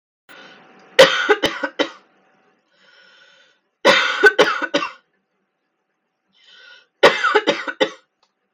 {"three_cough_length": "8.5 s", "three_cough_amplitude": 32768, "three_cough_signal_mean_std_ratio": 0.35, "survey_phase": "beta (2021-08-13 to 2022-03-07)", "age": "18-44", "gender": "Female", "wearing_mask": "No", "symptom_none": true, "symptom_onset": "13 days", "smoker_status": "Never smoked", "respiratory_condition_asthma": false, "respiratory_condition_other": false, "recruitment_source": "REACT", "submission_delay": "2 days", "covid_test_result": "Negative", "covid_test_method": "RT-qPCR"}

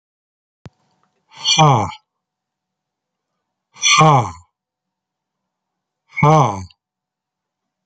{"exhalation_length": "7.9 s", "exhalation_amplitude": 30575, "exhalation_signal_mean_std_ratio": 0.32, "survey_phase": "beta (2021-08-13 to 2022-03-07)", "age": "45-64", "gender": "Male", "wearing_mask": "No", "symptom_other": true, "symptom_onset": "7 days", "smoker_status": "Ex-smoker", "respiratory_condition_asthma": false, "respiratory_condition_other": false, "recruitment_source": "Test and Trace", "submission_delay": "2 days", "covid_test_result": "Positive", "covid_test_method": "RT-qPCR"}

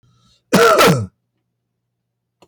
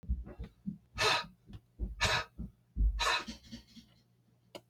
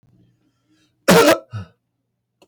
{"cough_length": "2.5 s", "cough_amplitude": 32263, "cough_signal_mean_std_ratio": 0.39, "exhalation_length": "4.7 s", "exhalation_amplitude": 5494, "exhalation_signal_mean_std_ratio": 0.49, "three_cough_length": "2.5 s", "three_cough_amplitude": 32768, "three_cough_signal_mean_std_ratio": 0.3, "survey_phase": "beta (2021-08-13 to 2022-03-07)", "age": "45-64", "gender": "Male", "wearing_mask": "No", "symptom_none": true, "smoker_status": "Ex-smoker", "respiratory_condition_asthma": false, "respiratory_condition_other": false, "recruitment_source": "REACT", "submission_delay": "1 day", "covid_test_result": "Negative", "covid_test_method": "RT-qPCR", "influenza_a_test_result": "Negative", "influenza_b_test_result": "Negative"}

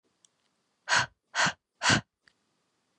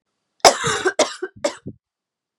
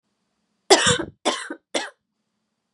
{"exhalation_length": "3.0 s", "exhalation_amplitude": 11482, "exhalation_signal_mean_std_ratio": 0.32, "cough_length": "2.4 s", "cough_amplitude": 32768, "cough_signal_mean_std_ratio": 0.35, "three_cough_length": "2.7 s", "three_cough_amplitude": 32767, "three_cough_signal_mean_std_ratio": 0.32, "survey_phase": "beta (2021-08-13 to 2022-03-07)", "age": "18-44", "gender": "Female", "wearing_mask": "No", "symptom_new_continuous_cough": true, "symptom_runny_or_blocked_nose": true, "symptom_onset": "4 days", "smoker_status": "Never smoked", "respiratory_condition_asthma": false, "respiratory_condition_other": false, "recruitment_source": "Test and Trace", "submission_delay": "2 days", "covid_test_result": "Positive", "covid_test_method": "RT-qPCR", "covid_ct_value": 27.2, "covid_ct_gene": "ORF1ab gene"}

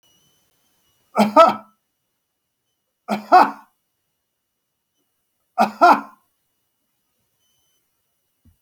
{"three_cough_length": "8.6 s", "three_cough_amplitude": 29210, "three_cough_signal_mean_std_ratio": 0.24, "survey_phase": "alpha (2021-03-01 to 2021-08-12)", "age": "45-64", "gender": "Male", "wearing_mask": "No", "symptom_none": true, "smoker_status": "Never smoked", "respiratory_condition_asthma": false, "respiratory_condition_other": false, "recruitment_source": "REACT", "submission_delay": "1 day", "covid_test_result": "Negative", "covid_test_method": "RT-qPCR"}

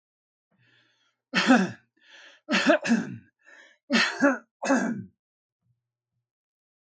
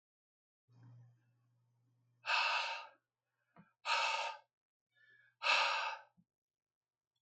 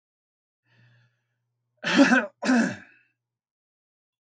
{"three_cough_length": "6.8 s", "three_cough_amplitude": 16120, "three_cough_signal_mean_std_ratio": 0.39, "exhalation_length": "7.2 s", "exhalation_amplitude": 3676, "exhalation_signal_mean_std_ratio": 0.38, "cough_length": "4.3 s", "cough_amplitude": 19107, "cough_signal_mean_std_ratio": 0.31, "survey_phase": "beta (2021-08-13 to 2022-03-07)", "age": "65+", "gender": "Male", "wearing_mask": "No", "symptom_none": true, "smoker_status": "Ex-smoker", "respiratory_condition_asthma": false, "respiratory_condition_other": false, "recruitment_source": "REACT", "submission_delay": "1 day", "covid_test_result": "Negative", "covid_test_method": "RT-qPCR", "influenza_a_test_result": "Negative", "influenza_b_test_result": "Negative"}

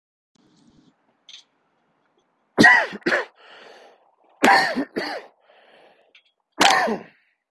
{"three_cough_length": "7.5 s", "three_cough_amplitude": 32768, "three_cough_signal_mean_std_ratio": 0.33, "survey_phase": "beta (2021-08-13 to 2022-03-07)", "age": "18-44", "gender": "Male", "wearing_mask": "No", "symptom_none": true, "smoker_status": "Ex-smoker", "respiratory_condition_asthma": false, "respiratory_condition_other": false, "recruitment_source": "REACT", "submission_delay": "2 days", "covid_test_result": "Negative", "covid_test_method": "RT-qPCR", "influenza_a_test_result": "Negative", "influenza_b_test_result": "Negative"}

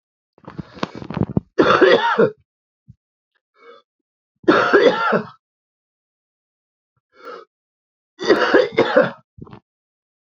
{"three_cough_length": "10.2 s", "three_cough_amplitude": 29296, "three_cough_signal_mean_std_ratio": 0.39, "survey_phase": "beta (2021-08-13 to 2022-03-07)", "age": "45-64", "gender": "Male", "wearing_mask": "No", "symptom_cough_any": true, "symptom_runny_or_blocked_nose": true, "symptom_shortness_of_breath": true, "smoker_status": "Ex-smoker", "respiratory_condition_asthma": false, "respiratory_condition_other": false, "recruitment_source": "Test and Trace", "submission_delay": "1 day", "covid_test_result": "Positive", "covid_test_method": "RT-qPCR", "covid_ct_value": 21.4, "covid_ct_gene": "ORF1ab gene", "covid_ct_mean": 21.8, "covid_viral_load": "72000 copies/ml", "covid_viral_load_category": "Low viral load (10K-1M copies/ml)"}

